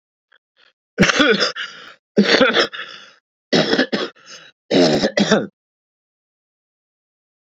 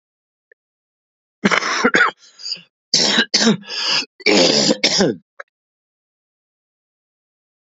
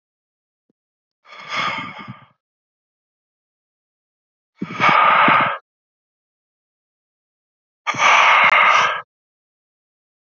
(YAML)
cough_length: 7.6 s
cough_amplitude: 32727
cough_signal_mean_std_ratio: 0.44
three_cough_length: 7.8 s
three_cough_amplitude: 32768
three_cough_signal_mean_std_ratio: 0.44
exhalation_length: 10.2 s
exhalation_amplitude: 29155
exhalation_signal_mean_std_ratio: 0.38
survey_phase: beta (2021-08-13 to 2022-03-07)
age: 45-64
gender: Male
wearing_mask: 'Yes'
symptom_cough_any: true
symptom_new_continuous_cough: true
symptom_fatigue: true
symptom_fever_high_temperature: true
symptom_headache: true
symptom_onset: 4 days
smoker_status: Current smoker (1 to 10 cigarettes per day)
respiratory_condition_asthma: false
respiratory_condition_other: false
recruitment_source: Test and Trace
submission_delay: 2 days
covid_test_result: Positive
covid_test_method: RT-qPCR
covid_ct_value: 29.8
covid_ct_gene: N gene